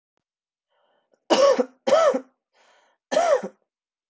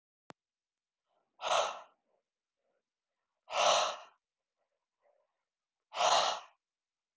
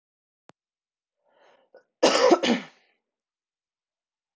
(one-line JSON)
{"three_cough_length": "4.1 s", "three_cough_amplitude": 17217, "three_cough_signal_mean_std_ratio": 0.41, "exhalation_length": "7.2 s", "exhalation_amplitude": 6587, "exhalation_signal_mean_std_ratio": 0.32, "cough_length": "4.4 s", "cough_amplitude": 17430, "cough_signal_mean_std_ratio": 0.27, "survey_phase": "alpha (2021-03-01 to 2021-08-12)", "age": "18-44", "gender": "Female", "wearing_mask": "No", "symptom_shortness_of_breath": true, "symptom_abdominal_pain": true, "symptom_fatigue": true, "symptom_headache": true, "symptom_onset": "6 days", "smoker_status": "Current smoker (1 to 10 cigarettes per day)", "respiratory_condition_asthma": true, "respiratory_condition_other": false, "recruitment_source": "Test and Trace", "submission_delay": "2 days", "covid_test_result": "Positive", "covid_test_method": "RT-qPCR", "covid_ct_value": 24.8, "covid_ct_gene": "ORF1ab gene"}